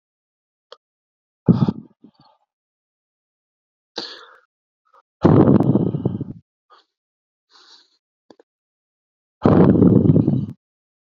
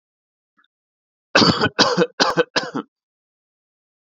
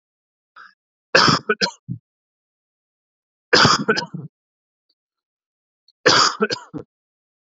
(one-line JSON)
{"exhalation_length": "11.1 s", "exhalation_amplitude": 32768, "exhalation_signal_mean_std_ratio": 0.33, "cough_length": "4.0 s", "cough_amplitude": 30612, "cough_signal_mean_std_ratio": 0.37, "three_cough_length": "7.6 s", "three_cough_amplitude": 32734, "three_cough_signal_mean_std_ratio": 0.32, "survey_phase": "beta (2021-08-13 to 2022-03-07)", "age": "18-44", "gender": "Male", "wearing_mask": "No", "symptom_none": true, "smoker_status": "Never smoked", "respiratory_condition_asthma": false, "respiratory_condition_other": false, "recruitment_source": "Test and Trace", "submission_delay": "2 days", "covid_test_result": "Positive", "covid_test_method": "RT-qPCR", "covid_ct_value": 26.7, "covid_ct_gene": "ORF1ab gene", "covid_ct_mean": 26.8, "covid_viral_load": "1600 copies/ml", "covid_viral_load_category": "Minimal viral load (< 10K copies/ml)"}